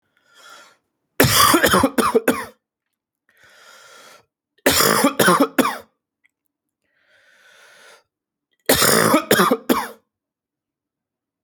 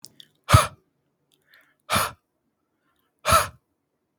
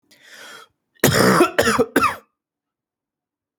{
  "three_cough_length": "11.4 s",
  "three_cough_amplitude": 32768,
  "three_cough_signal_mean_std_ratio": 0.41,
  "exhalation_length": "4.2 s",
  "exhalation_amplitude": 31292,
  "exhalation_signal_mean_std_ratio": 0.26,
  "cough_length": "3.6 s",
  "cough_amplitude": 32768,
  "cough_signal_mean_std_ratio": 0.42,
  "survey_phase": "beta (2021-08-13 to 2022-03-07)",
  "age": "18-44",
  "gender": "Male",
  "wearing_mask": "No",
  "symptom_cough_any": true,
  "symptom_runny_or_blocked_nose": true,
  "symptom_shortness_of_breath": true,
  "symptom_sore_throat": true,
  "symptom_abdominal_pain": true,
  "symptom_fatigue": true,
  "symptom_headache": true,
  "symptom_onset": "3 days",
  "smoker_status": "Never smoked",
  "respiratory_condition_asthma": false,
  "respiratory_condition_other": false,
  "recruitment_source": "Test and Trace",
  "submission_delay": "2 days",
  "covid_test_result": "Positive",
  "covid_test_method": "RT-qPCR",
  "covid_ct_value": 25.8,
  "covid_ct_gene": "N gene"
}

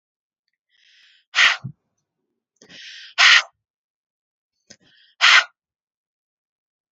{
  "exhalation_length": "6.9 s",
  "exhalation_amplitude": 30687,
  "exhalation_signal_mean_std_ratio": 0.25,
  "survey_phase": "beta (2021-08-13 to 2022-03-07)",
  "age": "18-44",
  "gender": "Female",
  "wearing_mask": "No",
  "symptom_none": true,
  "smoker_status": "Never smoked",
  "respiratory_condition_asthma": false,
  "respiratory_condition_other": false,
  "recruitment_source": "Test and Trace",
  "submission_delay": "1 day",
  "covid_test_result": "Negative",
  "covid_test_method": "RT-qPCR"
}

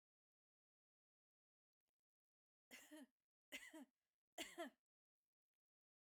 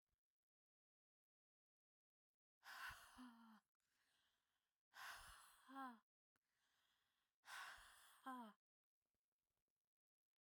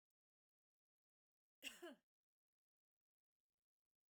{
  "three_cough_length": "6.1 s",
  "three_cough_amplitude": 400,
  "three_cough_signal_mean_std_ratio": 0.27,
  "exhalation_length": "10.4 s",
  "exhalation_amplitude": 215,
  "exhalation_signal_mean_std_ratio": 0.39,
  "cough_length": "4.1 s",
  "cough_amplitude": 417,
  "cough_signal_mean_std_ratio": 0.19,
  "survey_phase": "beta (2021-08-13 to 2022-03-07)",
  "age": "18-44",
  "gender": "Female",
  "wearing_mask": "No",
  "symptom_none": true,
  "smoker_status": "Never smoked",
  "respiratory_condition_asthma": false,
  "respiratory_condition_other": false,
  "recruitment_source": "REACT",
  "submission_delay": "1 day",
  "covid_test_result": "Negative",
  "covid_test_method": "RT-qPCR"
}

